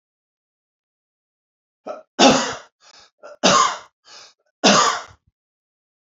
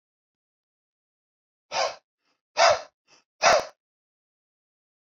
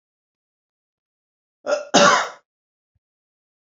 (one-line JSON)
{"three_cough_length": "6.1 s", "three_cough_amplitude": 32768, "three_cough_signal_mean_std_ratio": 0.33, "exhalation_length": "5.0 s", "exhalation_amplitude": 16737, "exhalation_signal_mean_std_ratio": 0.26, "cough_length": "3.8 s", "cough_amplitude": 30387, "cough_signal_mean_std_ratio": 0.27, "survey_phase": "beta (2021-08-13 to 2022-03-07)", "age": "45-64", "gender": "Male", "wearing_mask": "No", "symptom_none": true, "smoker_status": "Ex-smoker", "respiratory_condition_asthma": true, "respiratory_condition_other": false, "recruitment_source": "REACT", "submission_delay": "1 day", "covid_test_result": "Negative", "covid_test_method": "RT-qPCR"}